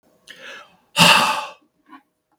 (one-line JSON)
{"exhalation_length": "2.4 s", "exhalation_amplitude": 32768, "exhalation_signal_mean_std_ratio": 0.36, "survey_phase": "beta (2021-08-13 to 2022-03-07)", "age": "65+", "gender": "Male", "wearing_mask": "No", "symptom_cough_any": true, "symptom_runny_or_blocked_nose": true, "symptom_onset": "12 days", "smoker_status": "Ex-smoker", "respiratory_condition_asthma": false, "respiratory_condition_other": false, "recruitment_source": "REACT", "submission_delay": "1 day", "covid_test_result": "Negative", "covid_test_method": "RT-qPCR"}